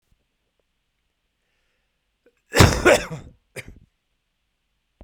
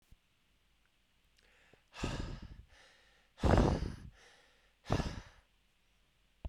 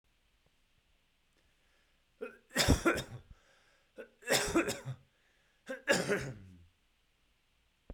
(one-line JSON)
{"cough_length": "5.0 s", "cough_amplitude": 32768, "cough_signal_mean_std_ratio": 0.23, "exhalation_length": "6.5 s", "exhalation_amplitude": 6725, "exhalation_signal_mean_std_ratio": 0.32, "three_cough_length": "7.9 s", "three_cough_amplitude": 7040, "three_cough_signal_mean_std_ratio": 0.34, "survey_phase": "beta (2021-08-13 to 2022-03-07)", "age": "18-44", "gender": "Male", "wearing_mask": "No", "symptom_cough_any": true, "symptom_fatigue": true, "symptom_headache": true, "smoker_status": "Never smoked", "respiratory_condition_asthma": false, "respiratory_condition_other": false, "recruitment_source": "Test and Trace", "submission_delay": "1 day", "covid_test_result": "Positive", "covid_test_method": "RT-qPCR", "covid_ct_value": 15.5, "covid_ct_gene": "ORF1ab gene", "covid_ct_mean": 15.9, "covid_viral_load": "6200000 copies/ml", "covid_viral_load_category": "High viral load (>1M copies/ml)"}